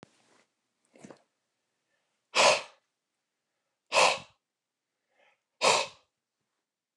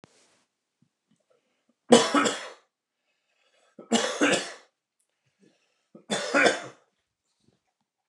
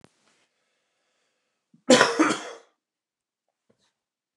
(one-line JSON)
{"exhalation_length": "7.0 s", "exhalation_amplitude": 13609, "exhalation_signal_mean_std_ratio": 0.25, "three_cough_length": "8.1 s", "three_cough_amplitude": 27427, "three_cough_signal_mean_std_ratio": 0.3, "cough_length": "4.4 s", "cough_amplitude": 29089, "cough_signal_mean_std_ratio": 0.24, "survey_phase": "beta (2021-08-13 to 2022-03-07)", "age": "45-64", "gender": "Male", "wearing_mask": "No", "symptom_none": true, "smoker_status": "Ex-smoker", "respiratory_condition_asthma": false, "respiratory_condition_other": false, "recruitment_source": "REACT", "submission_delay": "1 day", "covid_test_result": "Negative", "covid_test_method": "RT-qPCR"}